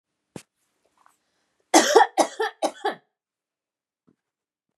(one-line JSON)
{"three_cough_length": "4.8 s", "three_cough_amplitude": 29168, "three_cough_signal_mean_std_ratio": 0.26, "survey_phase": "beta (2021-08-13 to 2022-03-07)", "age": "45-64", "gender": "Female", "wearing_mask": "No", "symptom_none": true, "smoker_status": "Never smoked", "respiratory_condition_asthma": false, "respiratory_condition_other": false, "recruitment_source": "REACT", "submission_delay": "1 day", "covid_test_result": "Negative", "covid_test_method": "RT-qPCR", "influenza_a_test_result": "Negative", "influenza_b_test_result": "Negative"}